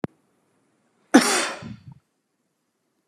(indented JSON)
{
  "cough_length": "3.1 s",
  "cough_amplitude": 32430,
  "cough_signal_mean_std_ratio": 0.26,
  "survey_phase": "beta (2021-08-13 to 2022-03-07)",
  "age": "45-64",
  "gender": "Male",
  "wearing_mask": "No",
  "symptom_none": true,
  "smoker_status": "Never smoked",
  "respiratory_condition_asthma": false,
  "respiratory_condition_other": false,
  "recruitment_source": "REACT",
  "submission_delay": "1 day",
  "covid_test_result": "Negative",
  "covid_test_method": "RT-qPCR"
}